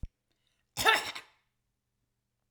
cough_length: 2.5 s
cough_amplitude: 12692
cough_signal_mean_std_ratio: 0.26
survey_phase: alpha (2021-03-01 to 2021-08-12)
age: 18-44
gender: Female
wearing_mask: 'No'
symptom_none: true
symptom_onset: 12 days
smoker_status: Never smoked
respiratory_condition_asthma: false
respiratory_condition_other: false
recruitment_source: REACT
submission_delay: 2 days
covid_test_result: Negative
covid_test_method: RT-qPCR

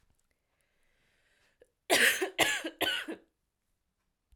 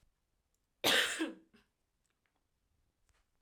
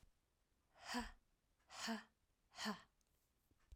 three_cough_length: 4.4 s
three_cough_amplitude: 10045
three_cough_signal_mean_std_ratio: 0.35
cough_length: 3.4 s
cough_amplitude: 5360
cough_signal_mean_std_ratio: 0.28
exhalation_length: 3.8 s
exhalation_amplitude: 820
exhalation_signal_mean_std_ratio: 0.39
survey_phase: alpha (2021-03-01 to 2021-08-12)
age: 18-44
gender: Female
wearing_mask: 'No'
symptom_change_to_sense_of_smell_or_taste: true
symptom_onset: 2 days
smoker_status: Never smoked
respiratory_condition_asthma: false
respiratory_condition_other: false
recruitment_source: Test and Trace
submission_delay: 1 day
covid_test_result: Positive
covid_test_method: RT-qPCR
covid_ct_value: 20.4
covid_ct_gene: ORF1ab gene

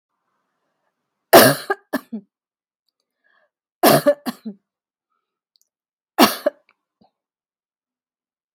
three_cough_length: 8.5 s
three_cough_amplitude: 32768
three_cough_signal_mean_std_ratio: 0.23
survey_phase: beta (2021-08-13 to 2022-03-07)
age: 45-64
gender: Female
wearing_mask: 'Yes'
symptom_none: true
smoker_status: Never smoked
respiratory_condition_asthma: false
respiratory_condition_other: false
recruitment_source: REACT
submission_delay: 3 days
covid_test_result: Negative
covid_test_method: RT-qPCR
influenza_a_test_result: Negative
influenza_b_test_result: Negative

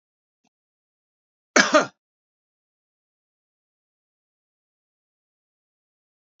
cough_length: 6.4 s
cough_amplitude: 27224
cough_signal_mean_std_ratio: 0.14
survey_phase: beta (2021-08-13 to 2022-03-07)
age: 65+
gender: Male
wearing_mask: 'No'
symptom_none: true
smoker_status: Never smoked
respiratory_condition_asthma: false
respiratory_condition_other: false
recruitment_source: REACT
submission_delay: 2 days
covid_test_result: Negative
covid_test_method: RT-qPCR
influenza_a_test_result: Negative
influenza_b_test_result: Negative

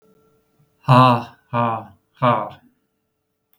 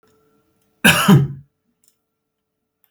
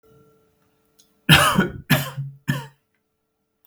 exhalation_length: 3.6 s
exhalation_amplitude: 32766
exhalation_signal_mean_std_ratio: 0.36
cough_length: 2.9 s
cough_amplitude: 32768
cough_signal_mean_std_ratio: 0.3
three_cough_length: 3.7 s
three_cough_amplitude: 32768
three_cough_signal_mean_std_ratio: 0.34
survey_phase: beta (2021-08-13 to 2022-03-07)
age: 45-64
gender: Male
wearing_mask: 'No'
symptom_none: true
smoker_status: Never smoked
respiratory_condition_asthma: false
respiratory_condition_other: false
recruitment_source: REACT
submission_delay: 3 days
covid_test_result: Negative
covid_test_method: RT-qPCR
influenza_a_test_result: Unknown/Void
influenza_b_test_result: Unknown/Void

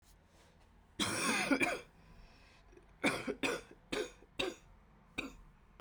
cough_length: 5.8 s
cough_amplitude: 4129
cough_signal_mean_std_ratio: 0.47
survey_phase: beta (2021-08-13 to 2022-03-07)
age: 18-44
gender: Female
wearing_mask: 'No'
symptom_cough_any: true
symptom_runny_or_blocked_nose: true
symptom_shortness_of_breath: true
symptom_sore_throat: true
symptom_headache: true
symptom_change_to_sense_of_smell_or_taste: true
symptom_loss_of_taste: true
symptom_onset: 4 days
smoker_status: Never smoked
respiratory_condition_asthma: false
respiratory_condition_other: false
recruitment_source: Test and Trace
submission_delay: 2 days
covid_test_result: Positive
covid_test_method: RT-qPCR
covid_ct_value: 12.9
covid_ct_gene: N gene
covid_ct_mean: 13.6
covid_viral_load: 34000000 copies/ml
covid_viral_load_category: High viral load (>1M copies/ml)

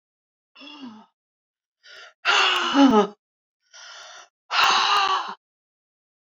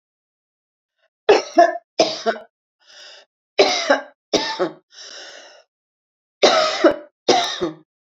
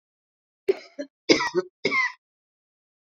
exhalation_length: 6.3 s
exhalation_amplitude: 20794
exhalation_signal_mean_std_ratio: 0.42
three_cough_length: 8.2 s
three_cough_amplitude: 29436
three_cough_signal_mean_std_ratio: 0.39
cough_length: 3.2 s
cough_amplitude: 23559
cough_signal_mean_std_ratio: 0.33
survey_phase: beta (2021-08-13 to 2022-03-07)
age: 65+
gender: Female
wearing_mask: 'No'
symptom_none: true
smoker_status: Never smoked
respiratory_condition_asthma: false
respiratory_condition_other: false
recruitment_source: REACT
submission_delay: 4 days
covid_test_result: Negative
covid_test_method: RT-qPCR
influenza_a_test_result: Negative
influenza_b_test_result: Negative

